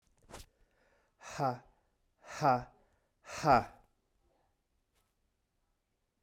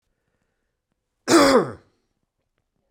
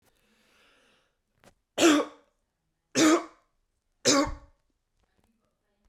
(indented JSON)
{
  "exhalation_length": "6.2 s",
  "exhalation_amplitude": 6605,
  "exhalation_signal_mean_std_ratio": 0.26,
  "cough_length": "2.9 s",
  "cough_amplitude": 23827,
  "cough_signal_mean_std_ratio": 0.3,
  "three_cough_length": "5.9 s",
  "three_cough_amplitude": 12892,
  "three_cough_signal_mean_std_ratio": 0.3,
  "survey_phase": "beta (2021-08-13 to 2022-03-07)",
  "age": "45-64",
  "gender": "Male",
  "wearing_mask": "No",
  "symptom_none": true,
  "smoker_status": "Never smoked",
  "respiratory_condition_asthma": false,
  "respiratory_condition_other": false,
  "recruitment_source": "REACT",
  "submission_delay": "1 day",
  "covid_test_result": "Negative",
  "covid_test_method": "RT-qPCR"
}